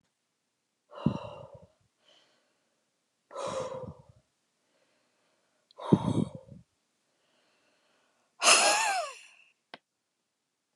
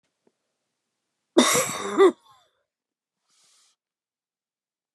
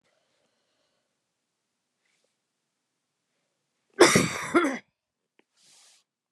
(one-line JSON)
{"exhalation_length": "10.8 s", "exhalation_amplitude": 16281, "exhalation_signal_mean_std_ratio": 0.28, "three_cough_length": "4.9 s", "three_cough_amplitude": 23937, "three_cough_signal_mean_std_ratio": 0.26, "cough_length": "6.3 s", "cough_amplitude": 27882, "cough_signal_mean_std_ratio": 0.22, "survey_phase": "beta (2021-08-13 to 2022-03-07)", "age": "65+", "gender": "Female", "wearing_mask": "No", "symptom_none": true, "smoker_status": "Never smoked", "respiratory_condition_asthma": false, "respiratory_condition_other": false, "recruitment_source": "REACT", "submission_delay": "5 days", "covid_test_result": "Negative", "covid_test_method": "RT-qPCR"}